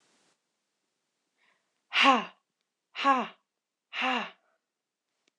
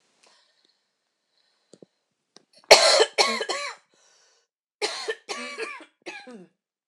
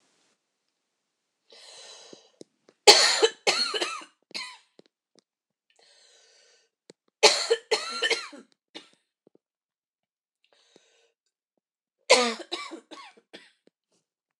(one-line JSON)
{"exhalation_length": "5.4 s", "exhalation_amplitude": 13756, "exhalation_signal_mean_std_ratio": 0.29, "cough_length": "6.9 s", "cough_amplitude": 26028, "cough_signal_mean_std_ratio": 0.28, "three_cough_length": "14.4 s", "three_cough_amplitude": 26028, "three_cough_signal_mean_std_ratio": 0.25, "survey_phase": "alpha (2021-03-01 to 2021-08-12)", "age": "18-44", "gender": "Female", "wearing_mask": "No", "symptom_none": true, "smoker_status": "Never smoked", "respiratory_condition_asthma": false, "respiratory_condition_other": false, "recruitment_source": "REACT", "submission_delay": "2 days", "covid_test_result": "Negative", "covid_test_method": "RT-qPCR"}